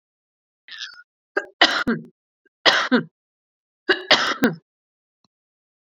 three_cough_length: 5.8 s
three_cough_amplitude: 32768
three_cough_signal_mean_std_ratio: 0.34
survey_phase: beta (2021-08-13 to 2022-03-07)
age: 45-64
gender: Female
wearing_mask: 'No'
symptom_cough_any: true
smoker_status: Current smoker (11 or more cigarettes per day)
respiratory_condition_asthma: true
respiratory_condition_other: false
recruitment_source: Test and Trace
submission_delay: 1 day
covid_test_result: Positive
covid_test_method: RT-qPCR
covid_ct_value: 18.5
covid_ct_gene: ORF1ab gene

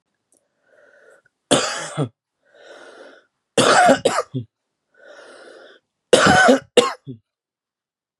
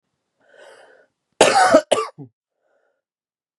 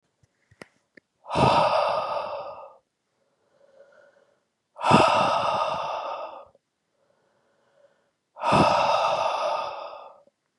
three_cough_length: 8.2 s
three_cough_amplitude: 32768
three_cough_signal_mean_std_ratio: 0.35
cough_length: 3.6 s
cough_amplitude: 32768
cough_signal_mean_std_ratio: 0.3
exhalation_length: 10.6 s
exhalation_amplitude: 24543
exhalation_signal_mean_std_ratio: 0.49
survey_phase: beta (2021-08-13 to 2022-03-07)
age: 18-44
gender: Male
wearing_mask: 'No'
symptom_diarrhoea: true
symptom_onset: 4 days
smoker_status: Current smoker (1 to 10 cigarettes per day)
respiratory_condition_asthma: true
respiratory_condition_other: false
recruitment_source: REACT
submission_delay: 5 days
covid_test_result: Negative
covid_test_method: RT-qPCR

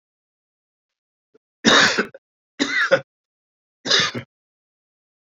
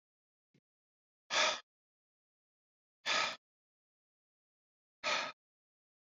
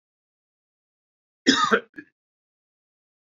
three_cough_length: 5.4 s
three_cough_amplitude: 27187
three_cough_signal_mean_std_ratio: 0.33
exhalation_length: 6.1 s
exhalation_amplitude: 3770
exhalation_signal_mean_std_ratio: 0.28
cough_length: 3.2 s
cough_amplitude: 22425
cough_signal_mean_std_ratio: 0.23
survey_phase: beta (2021-08-13 to 2022-03-07)
age: 45-64
gender: Male
wearing_mask: 'No'
symptom_cough_any: true
symptom_runny_or_blocked_nose: true
symptom_fatigue: true
symptom_change_to_sense_of_smell_or_taste: true
smoker_status: Never smoked
respiratory_condition_asthma: false
respiratory_condition_other: false
recruitment_source: Test and Trace
submission_delay: 2 days
covid_test_result: Positive
covid_test_method: RT-qPCR
covid_ct_value: 21.6
covid_ct_gene: ORF1ab gene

